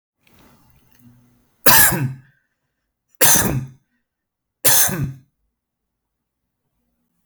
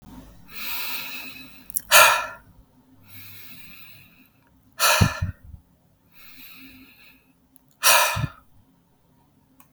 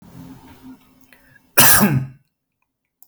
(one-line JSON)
{"three_cough_length": "7.3 s", "three_cough_amplitude": 32768, "three_cough_signal_mean_std_ratio": 0.33, "exhalation_length": "9.7 s", "exhalation_amplitude": 32768, "exhalation_signal_mean_std_ratio": 0.33, "cough_length": "3.1 s", "cough_amplitude": 32768, "cough_signal_mean_std_ratio": 0.34, "survey_phase": "beta (2021-08-13 to 2022-03-07)", "age": "18-44", "gender": "Male", "wearing_mask": "No", "symptom_none": true, "smoker_status": "Never smoked", "respiratory_condition_asthma": false, "respiratory_condition_other": false, "recruitment_source": "REACT", "submission_delay": "3 days", "covid_test_result": "Negative", "covid_test_method": "RT-qPCR"}